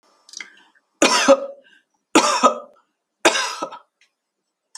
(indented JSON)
{
  "three_cough_length": "4.8 s",
  "three_cough_amplitude": 31293,
  "three_cough_signal_mean_std_ratio": 0.36,
  "survey_phase": "alpha (2021-03-01 to 2021-08-12)",
  "age": "65+",
  "gender": "Female",
  "wearing_mask": "No",
  "symptom_none": true,
  "smoker_status": "Never smoked",
  "respiratory_condition_asthma": false,
  "respiratory_condition_other": false,
  "recruitment_source": "REACT",
  "submission_delay": "2 days",
  "covid_test_result": "Negative",
  "covid_test_method": "RT-qPCR"
}